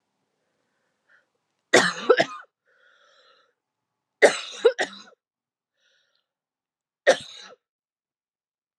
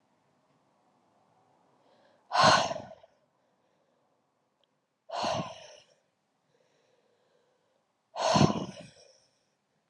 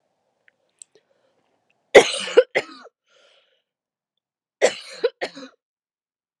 {
  "three_cough_length": "8.8 s",
  "three_cough_amplitude": 29065,
  "three_cough_signal_mean_std_ratio": 0.22,
  "exhalation_length": "9.9 s",
  "exhalation_amplitude": 11658,
  "exhalation_signal_mean_std_ratio": 0.27,
  "cough_length": "6.4 s",
  "cough_amplitude": 32768,
  "cough_signal_mean_std_ratio": 0.2,
  "survey_phase": "alpha (2021-03-01 to 2021-08-12)",
  "age": "18-44",
  "gender": "Female",
  "wearing_mask": "No",
  "symptom_fatigue": true,
  "symptom_fever_high_temperature": true,
  "symptom_headache": true,
  "symptom_change_to_sense_of_smell_or_taste": true,
  "symptom_loss_of_taste": true,
  "symptom_onset": "6 days",
  "smoker_status": "Ex-smoker",
  "respiratory_condition_asthma": false,
  "respiratory_condition_other": false,
  "recruitment_source": "Test and Trace",
  "submission_delay": "2 days",
  "covid_test_result": "Positive",
  "covid_test_method": "RT-qPCR",
  "covid_ct_value": 20.1,
  "covid_ct_gene": "ORF1ab gene",
  "covid_ct_mean": 21.0,
  "covid_viral_load": "130000 copies/ml",
  "covid_viral_load_category": "Low viral load (10K-1M copies/ml)"
}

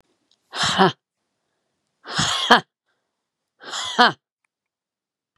{
  "exhalation_length": "5.4 s",
  "exhalation_amplitude": 32768,
  "exhalation_signal_mean_std_ratio": 0.31,
  "survey_phase": "beta (2021-08-13 to 2022-03-07)",
  "age": "45-64",
  "gender": "Female",
  "wearing_mask": "No",
  "symptom_none": true,
  "smoker_status": "Never smoked",
  "respiratory_condition_asthma": false,
  "respiratory_condition_other": false,
  "recruitment_source": "REACT",
  "submission_delay": "1 day",
  "covid_test_result": "Negative",
  "covid_test_method": "RT-qPCR",
  "influenza_a_test_result": "Negative",
  "influenza_b_test_result": "Negative"
}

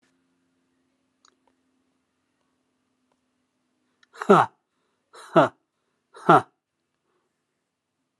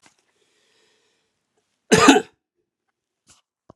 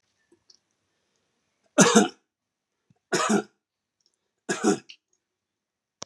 {
  "exhalation_length": "8.2 s",
  "exhalation_amplitude": 27546,
  "exhalation_signal_mean_std_ratio": 0.18,
  "cough_length": "3.8 s",
  "cough_amplitude": 32767,
  "cough_signal_mean_std_ratio": 0.22,
  "three_cough_length": "6.1 s",
  "three_cough_amplitude": 26085,
  "three_cough_signal_mean_std_ratio": 0.27,
  "survey_phase": "alpha (2021-03-01 to 2021-08-12)",
  "age": "65+",
  "gender": "Male",
  "wearing_mask": "No",
  "symptom_none": true,
  "smoker_status": "Never smoked",
  "respiratory_condition_asthma": false,
  "respiratory_condition_other": false,
  "recruitment_source": "REACT",
  "submission_delay": "1 day",
  "covid_test_result": "Negative",
  "covid_test_method": "RT-qPCR"
}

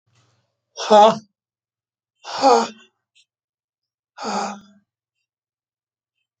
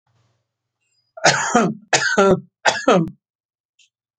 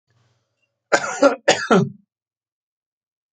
{
  "exhalation_length": "6.4 s",
  "exhalation_amplitude": 27530,
  "exhalation_signal_mean_std_ratio": 0.27,
  "three_cough_length": "4.2 s",
  "three_cough_amplitude": 31434,
  "three_cough_signal_mean_std_ratio": 0.43,
  "cough_length": "3.3 s",
  "cough_amplitude": 27989,
  "cough_signal_mean_std_ratio": 0.32,
  "survey_phase": "alpha (2021-03-01 to 2021-08-12)",
  "age": "65+",
  "gender": "Male",
  "wearing_mask": "No",
  "symptom_none": true,
  "smoker_status": "Ex-smoker",
  "respiratory_condition_asthma": false,
  "respiratory_condition_other": false,
  "recruitment_source": "REACT",
  "submission_delay": "4 days",
  "covid_test_result": "Negative",
  "covid_test_method": "RT-qPCR"
}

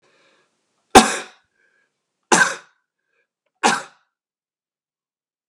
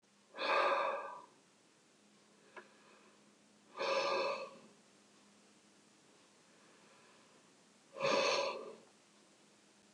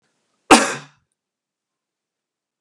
{
  "three_cough_length": "5.5 s",
  "three_cough_amplitude": 32768,
  "three_cough_signal_mean_std_ratio": 0.22,
  "exhalation_length": "9.9 s",
  "exhalation_amplitude": 3036,
  "exhalation_signal_mean_std_ratio": 0.42,
  "cough_length": "2.6 s",
  "cough_amplitude": 32768,
  "cough_signal_mean_std_ratio": 0.2,
  "survey_phase": "beta (2021-08-13 to 2022-03-07)",
  "age": "65+",
  "gender": "Male",
  "wearing_mask": "No",
  "symptom_none": true,
  "smoker_status": "Never smoked",
  "respiratory_condition_asthma": false,
  "respiratory_condition_other": false,
  "recruitment_source": "REACT",
  "submission_delay": "1 day",
  "covid_test_result": "Negative",
  "covid_test_method": "RT-qPCR"
}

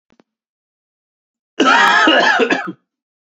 {
  "cough_length": "3.2 s",
  "cough_amplitude": 30331,
  "cough_signal_mean_std_ratio": 0.5,
  "survey_phase": "beta (2021-08-13 to 2022-03-07)",
  "age": "18-44",
  "gender": "Male",
  "wearing_mask": "No",
  "symptom_new_continuous_cough": true,
  "symptom_runny_or_blocked_nose": true,
  "symptom_shortness_of_breath": true,
  "symptom_diarrhoea": true,
  "symptom_fatigue": true,
  "symptom_headache": true,
  "symptom_onset": "6 days",
  "smoker_status": "Never smoked",
  "respiratory_condition_asthma": false,
  "respiratory_condition_other": false,
  "recruitment_source": "Test and Trace",
  "submission_delay": "1 day",
  "covid_test_result": "Positive",
  "covid_test_method": "RT-qPCR"
}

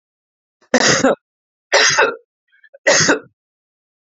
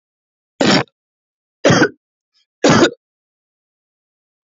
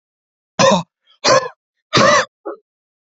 {
  "cough_length": "4.0 s",
  "cough_amplitude": 32768,
  "cough_signal_mean_std_ratio": 0.43,
  "three_cough_length": "4.4 s",
  "three_cough_amplitude": 30115,
  "three_cough_signal_mean_std_ratio": 0.33,
  "exhalation_length": "3.1 s",
  "exhalation_amplitude": 31272,
  "exhalation_signal_mean_std_ratio": 0.42,
  "survey_phase": "alpha (2021-03-01 to 2021-08-12)",
  "age": "18-44",
  "gender": "Male",
  "wearing_mask": "No",
  "symptom_none": true,
  "smoker_status": "Ex-smoker",
  "respiratory_condition_asthma": false,
  "respiratory_condition_other": false,
  "recruitment_source": "REACT",
  "submission_delay": "1 day",
  "covid_test_result": "Negative",
  "covid_test_method": "RT-qPCR"
}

